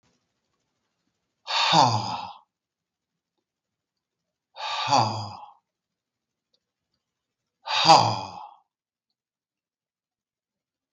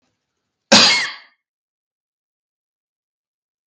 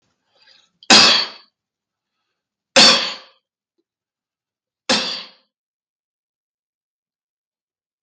{"exhalation_length": "10.9 s", "exhalation_amplitude": 23441, "exhalation_signal_mean_std_ratio": 0.29, "cough_length": "3.7 s", "cough_amplitude": 32768, "cough_signal_mean_std_ratio": 0.25, "three_cough_length": "8.0 s", "three_cough_amplitude": 32768, "three_cough_signal_mean_std_ratio": 0.26, "survey_phase": "beta (2021-08-13 to 2022-03-07)", "age": "45-64", "gender": "Male", "wearing_mask": "No", "symptom_none": true, "smoker_status": "Ex-smoker", "respiratory_condition_asthma": false, "respiratory_condition_other": false, "recruitment_source": "REACT", "submission_delay": "6 days", "covid_test_result": "Negative", "covid_test_method": "RT-qPCR", "influenza_a_test_result": "Unknown/Void", "influenza_b_test_result": "Unknown/Void"}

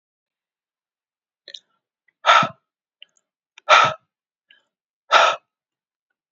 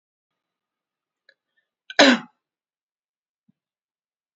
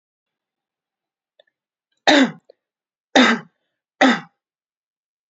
{"exhalation_length": "6.3 s", "exhalation_amplitude": 30990, "exhalation_signal_mean_std_ratio": 0.25, "cough_length": "4.4 s", "cough_amplitude": 29191, "cough_signal_mean_std_ratio": 0.16, "three_cough_length": "5.3 s", "three_cough_amplitude": 29352, "three_cough_signal_mean_std_ratio": 0.27, "survey_phase": "beta (2021-08-13 to 2022-03-07)", "age": "18-44", "gender": "Female", "wearing_mask": "No", "symptom_fatigue": true, "symptom_onset": "5 days", "smoker_status": "Never smoked", "respiratory_condition_asthma": false, "respiratory_condition_other": false, "recruitment_source": "REACT", "submission_delay": "2 days", "covid_test_result": "Negative", "covid_test_method": "RT-qPCR", "influenza_a_test_result": "Negative", "influenza_b_test_result": "Negative"}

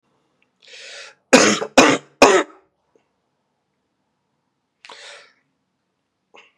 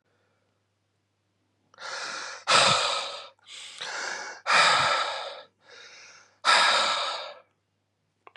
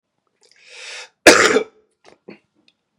{"three_cough_length": "6.6 s", "three_cough_amplitude": 32768, "three_cough_signal_mean_std_ratio": 0.26, "exhalation_length": "8.4 s", "exhalation_amplitude": 15107, "exhalation_signal_mean_std_ratio": 0.48, "cough_length": "3.0 s", "cough_amplitude": 32768, "cough_signal_mean_std_ratio": 0.27, "survey_phase": "beta (2021-08-13 to 2022-03-07)", "age": "18-44", "gender": "Male", "wearing_mask": "No", "symptom_runny_or_blocked_nose": true, "symptom_diarrhoea": true, "symptom_fatigue": true, "symptom_headache": true, "symptom_onset": "3 days", "smoker_status": "Ex-smoker", "recruitment_source": "Test and Trace", "submission_delay": "2 days", "covid_test_result": "Positive", "covid_test_method": "RT-qPCR", "covid_ct_value": 21.4, "covid_ct_gene": "ORF1ab gene", "covid_ct_mean": 21.6, "covid_viral_load": "83000 copies/ml", "covid_viral_load_category": "Low viral load (10K-1M copies/ml)"}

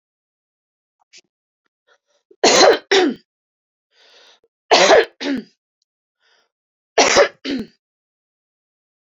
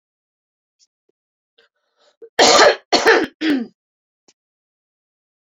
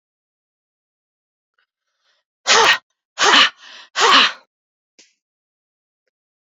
{"three_cough_length": "9.1 s", "three_cough_amplitude": 32611, "three_cough_signal_mean_std_ratio": 0.32, "cough_length": "5.5 s", "cough_amplitude": 32768, "cough_signal_mean_std_ratio": 0.31, "exhalation_length": "6.6 s", "exhalation_amplitude": 32767, "exhalation_signal_mean_std_ratio": 0.31, "survey_phase": "beta (2021-08-13 to 2022-03-07)", "age": "45-64", "gender": "Female", "wearing_mask": "No", "symptom_fatigue": true, "symptom_headache": true, "smoker_status": "Ex-smoker", "respiratory_condition_asthma": false, "respiratory_condition_other": false, "recruitment_source": "REACT", "submission_delay": "3 days", "covid_test_result": "Negative", "covid_test_method": "RT-qPCR"}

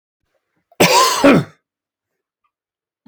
{"cough_length": "3.1 s", "cough_amplitude": 30948, "cough_signal_mean_std_ratio": 0.36, "survey_phase": "alpha (2021-03-01 to 2021-08-12)", "age": "65+", "gender": "Male", "wearing_mask": "No", "symptom_none": true, "smoker_status": "Never smoked", "respiratory_condition_asthma": false, "respiratory_condition_other": false, "recruitment_source": "REACT", "submission_delay": "2 days", "covid_test_result": "Negative", "covid_test_method": "RT-qPCR"}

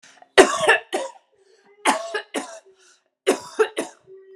{"three_cough_length": "4.4 s", "three_cough_amplitude": 32767, "three_cough_signal_mean_std_ratio": 0.36, "survey_phase": "beta (2021-08-13 to 2022-03-07)", "age": "18-44", "gender": "Female", "wearing_mask": "No", "symptom_none": true, "smoker_status": "Ex-smoker", "respiratory_condition_asthma": false, "respiratory_condition_other": false, "recruitment_source": "Test and Trace", "submission_delay": "2 days", "covid_test_result": "Positive", "covid_test_method": "RT-qPCR", "covid_ct_value": 30.7, "covid_ct_gene": "N gene"}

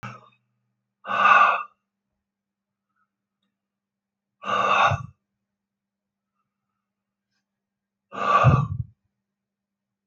{"exhalation_length": "10.1 s", "exhalation_amplitude": 22913, "exhalation_signal_mean_std_ratio": 0.32, "survey_phase": "alpha (2021-03-01 to 2021-08-12)", "age": "65+", "gender": "Male", "wearing_mask": "No", "symptom_none": true, "smoker_status": "Current smoker (11 or more cigarettes per day)", "respiratory_condition_asthma": false, "respiratory_condition_other": false, "recruitment_source": "REACT", "submission_delay": "1 day", "covid_test_result": "Negative", "covid_test_method": "RT-qPCR"}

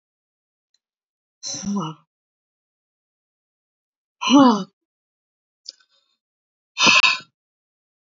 {"exhalation_length": "8.2 s", "exhalation_amplitude": 27085, "exhalation_signal_mean_std_ratio": 0.26, "survey_phase": "alpha (2021-03-01 to 2021-08-12)", "age": "45-64", "gender": "Female", "wearing_mask": "No", "symptom_cough_any": true, "symptom_headache": true, "symptom_onset": "5 days", "smoker_status": "Never smoked", "respiratory_condition_asthma": false, "respiratory_condition_other": false, "recruitment_source": "REACT", "submission_delay": "2 days", "covid_test_result": "Negative", "covid_test_method": "RT-qPCR"}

